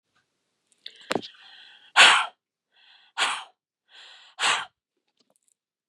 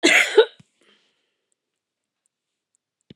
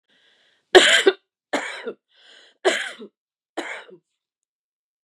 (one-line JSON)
{"exhalation_length": "5.9 s", "exhalation_amplitude": 27461, "exhalation_signal_mean_std_ratio": 0.26, "cough_length": "3.2 s", "cough_amplitude": 28661, "cough_signal_mean_std_ratio": 0.26, "three_cough_length": "5.0 s", "three_cough_amplitude": 32767, "three_cough_signal_mean_std_ratio": 0.28, "survey_phase": "beta (2021-08-13 to 2022-03-07)", "age": "45-64", "gender": "Female", "wearing_mask": "No", "symptom_none": true, "smoker_status": "Never smoked", "respiratory_condition_asthma": false, "respiratory_condition_other": false, "recruitment_source": "Test and Trace", "submission_delay": "2 days", "covid_test_result": "Negative", "covid_test_method": "RT-qPCR"}